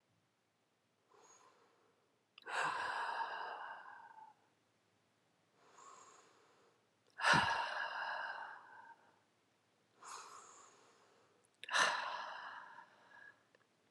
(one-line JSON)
{"exhalation_length": "13.9 s", "exhalation_amplitude": 3812, "exhalation_signal_mean_std_ratio": 0.4, "survey_phase": "alpha (2021-03-01 to 2021-08-12)", "age": "18-44", "gender": "Female", "wearing_mask": "No", "symptom_cough_any": true, "symptom_fatigue": true, "symptom_fever_high_temperature": true, "symptom_headache": true, "symptom_change_to_sense_of_smell_or_taste": true, "symptom_loss_of_taste": true, "smoker_status": "Current smoker (11 or more cigarettes per day)", "respiratory_condition_asthma": false, "respiratory_condition_other": false, "recruitment_source": "Test and Trace", "submission_delay": "2 days", "covid_test_result": "Positive", "covid_test_method": "LFT"}